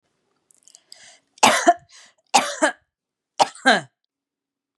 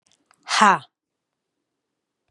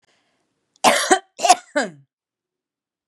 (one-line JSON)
{"three_cough_length": "4.8 s", "three_cough_amplitude": 30868, "three_cough_signal_mean_std_ratio": 0.3, "exhalation_length": "2.3 s", "exhalation_amplitude": 30385, "exhalation_signal_mean_std_ratio": 0.24, "cough_length": "3.1 s", "cough_amplitude": 32433, "cough_signal_mean_std_ratio": 0.31, "survey_phase": "beta (2021-08-13 to 2022-03-07)", "age": "45-64", "gender": "Female", "wearing_mask": "No", "symptom_none": true, "smoker_status": "Never smoked", "respiratory_condition_asthma": false, "respiratory_condition_other": false, "recruitment_source": "REACT", "submission_delay": "1 day", "covid_test_result": "Negative", "covid_test_method": "RT-qPCR", "influenza_a_test_result": "Negative", "influenza_b_test_result": "Negative"}